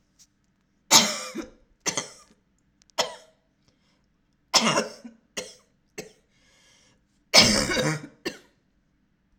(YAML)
three_cough_length: 9.4 s
three_cough_amplitude: 31253
three_cough_signal_mean_std_ratio: 0.3
survey_phase: alpha (2021-03-01 to 2021-08-12)
age: 18-44
gender: Female
wearing_mask: 'No'
symptom_none: true
smoker_status: Never smoked
respiratory_condition_asthma: false
respiratory_condition_other: false
recruitment_source: REACT
submission_delay: 5 days
covid_test_result: Negative
covid_test_method: RT-qPCR